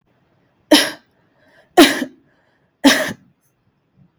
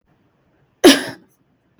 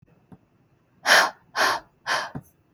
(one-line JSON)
{"three_cough_length": "4.2 s", "three_cough_amplitude": 32768, "three_cough_signal_mean_std_ratio": 0.29, "cough_length": "1.8 s", "cough_amplitude": 32768, "cough_signal_mean_std_ratio": 0.25, "exhalation_length": "2.7 s", "exhalation_amplitude": 25198, "exhalation_signal_mean_std_ratio": 0.38, "survey_phase": "beta (2021-08-13 to 2022-03-07)", "age": "18-44", "gender": "Female", "wearing_mask": "Yes", "symptom_none": true, "smoker_status": "Never smoked", "respiratory_condition_asthma": false, "respiratory_condition_other": false, "recruitment_source": "REACT", "submission_delay": "1 day", "covid_test_result": "Negative", "covid_test_method": "RT-qPCR", "influenza_a_test_result": "Negative", "influenza_b_test_result": "Negative"}